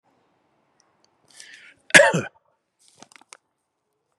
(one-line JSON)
{"cough_length": "4.2 s", "cough_amplitude": 32768, "cough_signal_mean_std_ratio": 0.19, "survey_phase": "beta (2021-08-13 to 2022-03-07)", "age": "45-64", "gender": "Male", "wearing_mask": "No", "symptom_none": true, "symptom_onset": "12 days", "smoker_status": "Never smoked", "respiratory_condition_asthma": false, "respiratory_condition_other": false, "recruitment_source": "REACT", "submission_delay": "2 days", "covid_test_result": "Negative", "covid_test_method": "RT-qPCR", "influenza_a_test_result": "Negative", "influenza_b_test_result": "Negative"}